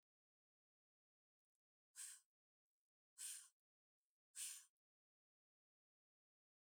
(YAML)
exhalation_length: 6.7 s
exhalation_amplitude: 395
exhalation_signal_mean_std_ratio: 0.25
survey_phase: beta (2021-08-13 to 2022-03-07)
age: 65+
gender: Female
wearing_mask: 'No'
symptom_none: true
smoker_status: Never smoked
respiratory_condition_asthma: false
respiratory_condition_other: false
recruitment_source: REACT
submission_delay: 1 day
covid_test_result: Negative
covid_test_method: RT-qPCR
influenza_a_test_result: Negative
influenza_b_test_result: Negative